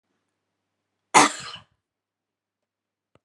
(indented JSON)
{
  "cough_length": "3.2 s",
  "cough_amplitude": 31385,
  "cough_signal_mean_std_ratio": 0.18,
  "survey_phase": "beta (2021-08-13 to 2022-03-07)",
  "age": "65+",
  "gender": "Female",
  "wearing_mask": "No",
  "symptom_none": true,
  "smoker_status": "Never smoked",
  "respiratory_condition_asthma": false,
  "respiratory_condition_other": false,
  "recruitment_source": "REACT",
  "submission_delay": "1 day",
  "covid_test_result": "Negative",
  "covid_test_method": "RT-qPCR",
  "influenza_a_test_result": "Negative",
  "influenza_b_test_result": "Negative"
}